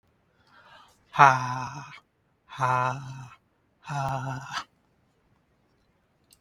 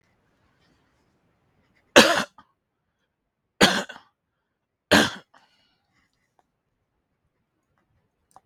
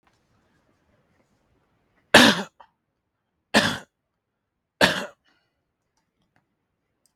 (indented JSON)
{
  "exhalation_length": "6.4 s",
  "exhalation_amplitude": 32452,
  "exhalation_signal_mean_std_ratio": 0.32,
  "cough_length": "8.5 s",
  "cough_amplitude": 32768,
  "cough_signal_mean_std_ratio": 0.2,
  "three_cough_length": "7.2 s",
  "three_cough_amplitude": 32742,
  "three_cough_signal_mean_std_ratio": 0.21,
  "survey_phase": "beta (2021-08-13 to 2022-03-07)",
  "age": "45-64",
  "gender": "Male",
  "wearing_mask": "No",
  "symptom_none": true,
  "smoker_status": "Ex-smoker",
  "respiratory_condition_asthma": false,
  "respiratory_condition_other": false,
  "recruitment_source": "REACT",
  "submission_delay": "3 days",
  "covid_test_result": "Negative",
  "covid_test_method": "RT-qPCR",
  "influenza_a_test_result": "Unknown/Void",
  "influenza_b_test_result": "Unknown/Void"
}